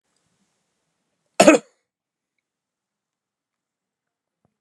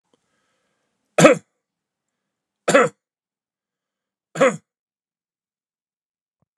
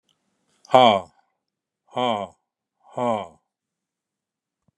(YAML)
cough_length: 4.6 s
cough_amplitude: 32768
cough_signal_mean_std_ratio: 0.15
three_cough_length: 6.6 s
three_cough_amplitude: 32768
three_cough_signal_mean_std_ratio: 0.21
exhalation_length: 4.8 s
exhalation_amplitude: 32219
exhalation_signal_mean_std_ratio: 0.27
survey_phase: beta (2021-08-13 to 2022-03-07)
age: 65+
gender: Male
wearing_mask: 'No'
symptom_none: true
smoker_status: Ex-smoker
respiratory_condition_asthma: false
respiratory_condition_other: false
recruitment_source: REACT
submission_delay: 0 days
covid_test_result: Negative
covid_test_method: RT-qPCR
influenza_a_test_result: Negative
influenza_b_test_result: Negative